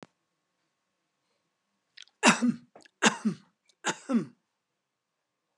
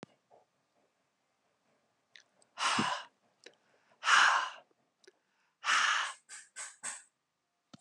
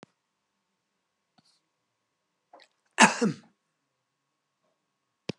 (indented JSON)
{
  "three_cough_length": "5.6 s",
  "three_cough_amplitude": 16522,
  "three_cough_signal_mean_std_ratio": 0.27,
  "exhalation_length": "7.8 s",
  "exhalation_amplitude": 8503,
  "exhalation_signal_mean_std_ratio": 0.34,
  "cough_length": "5.4 s",
  "cough_amplitude": 20405,
  "cough_signal_mean_std_ratio": 0.16,
  "survey_phase": "beta (2021-08-13 to 2022-03-07)",
  "age": "65+",
  "gender": "Male",
  "wearing_mask": "No",
  "symptom_none": true,
  "smoker_status": "Never smoked",
  "respiratory_condition_asthma": true,
  "respiratory_condition_other": false,
  "recruitment_source": "REACT",
  "submission_delay": "2 days",
  "covid_test_result": "Negative",
  "covid_test_method": "RT-qPCR"
}